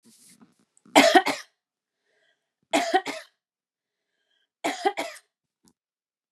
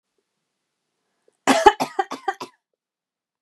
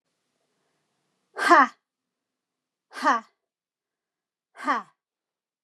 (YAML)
three_cough_length: 6.3 s
three_cough_amplitude: 27494
three_cough_signal_mean_std_ratio: 0.27
cough_length: 3.4 s
cough_amplitude: 32767
cough_signal_mean_std_ratio: 0.24
exhalation_length: 5.6 s
exhalation_amplitude: 23364
exhalation_signal_mean_std_ratio: 0.24
survey_phase: beta (2021-08-13 to 2022-03-07)
age: 45-64
gender: Female
wearing_mask: 'No'
symptom_runny_or_blocked_nose: true
smoker_status: Never smoked
respiratory_condition_asthma: false
respiratory_condition_other: false
recruitment_source: REACT
submission_delay: 2 days
covid_test_result: Negative
covid_test_method: RT-qPCR
influenza_a_test_result: Negative
influenza_b_test_result: Negative